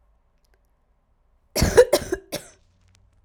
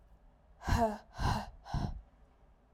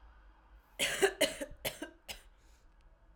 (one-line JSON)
{"cough_length": "3.2 s", "cough_amplitude": 29684, "cough_signal_mean_std_ratio": 0.26, "exhalation_length": "2.7 s", "exhalation_amplitude": 4119, "exhalation_signal_mean_std_ratio": 0.49, "three_cough_length": "3.2 s", "three_cough_amplitude": 5883, "three_cough_signal_mean_std_ratio": 0.38, "survey_phase": "alpha (2021-03-01 to 2021-08-12)", "age": "18-44", "gender": "Female", "wearing_mask": "No", "symptom_cough_any": true, "symptom_fatigue": true, "symptom_fever_high_temperature": true, "symptom_headache": true, "symptom_change_to_sense_of_smell_or_taste": true, "smoker_status": "Prefer not to say", "respiratory_condition_asthma": false, "respiratory_condition_other": false, "recruitment_source": "Test and Trace", "submission_delay": "1 day", "covid_test_result": "Positive", "covid_test_method": "LFT"}